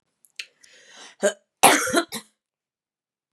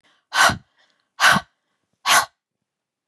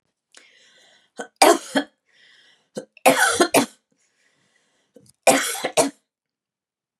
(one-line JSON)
{"cough_length": "3.3 s", "cough_amplitude": 32767, "cough_signal_mean_std_ratio": 0.29, "exhalation_length": "3.1 s", "exhalation_amplitude": 28467, "exhalation_signal_mean_std_ratio": 0.35, "three_cough_length": "7.0 s", "three_cough_amplitude": 31201, "three_cough_signal_mean_std_ratio": 0.32, "survey_phase": "beta (2021-08-13 to 2022-03-07)", "age": "45-64", "gender": "Female", "wearing_mask": "No", "symptom_none": true, "smoker_status": "Ex-smoker", "respiratory_condition_asthma": false, "respiratory_condition_other": false, "recruitment_source": "REACT", "submission_delay": "1 day", "covid_test_result": "Negative", "covid_test_method": "RT-qPCR", "influenza_a_test_result": "Negative", "influenza_b_test_result": "Negative"}